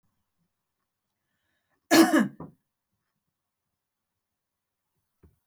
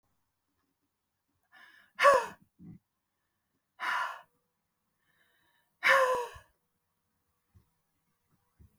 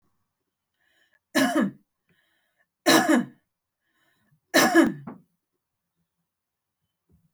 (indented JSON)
{
  "cough_length": "5.5 s",
  "cough_amplitude": 15846,
  "cough_signal_mean_std_ratio": 0.2,
  "exhalation_length": "8.8 s",
  "exhalation_amplitude": 11193,
  "exhalation_signal_mean_std_ratio": 0.25,
  "three_cough_length": "7.3 s",
  "three_cough_amplitude": 20453,
  "three_cough_signal_mean_std_ratio": 0.31,
  "survey_phase": "beta (2021-08-13 to 2022-03-07)",
  "age": "45-64",
  "gender": "Female",
  "wearing_mask": "No",
  "symptom_none": true,
  "smoker_status": "Never smoked",
  "respiratory_condition_asthma": false,
  "respiratory_condition_other": false,
  "recruitment_source": "REACT",
  "submission_delay": "2 days",
  "covid_test_result": "Negative",
  "covid_test_method": "RT-qPCR",
  "influenza_a_test_result": "Negative",
  "influenza_b_test_result": "Negative"
}